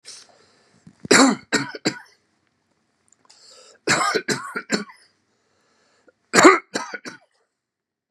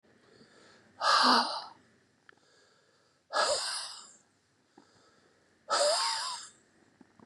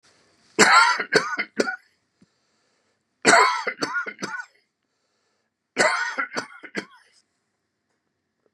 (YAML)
three_cough_length: 8.1 s
three_cough_amplitude: 32768
three_cough_signal_mean_std_ratio: 0.3
exhalation_length: 7.3 s
exhalation_amplitude: 10165
exhalation_signal_mean_std_ratio: 0.41
cough_length: 8.5 s
cough_amplitude: 29405
cough_signal_mean_std_ratio: 0.37
survey_phase: beta (2021-08-13 to 2022-03-07)
age: 65+
gender: Male
wearing_mask: 'No'
symptom_none: true
smoker_status: Ex-smoker
respiratory_condition_asthma: false
respiratory_condition_other: false
recruitment_source: REACT
submission_delay: 1 day
covid_test_result: Negative
covid_test_method: RT-qPCR
influenza_a_test_result: Negative
influenza_b_test_result: Negative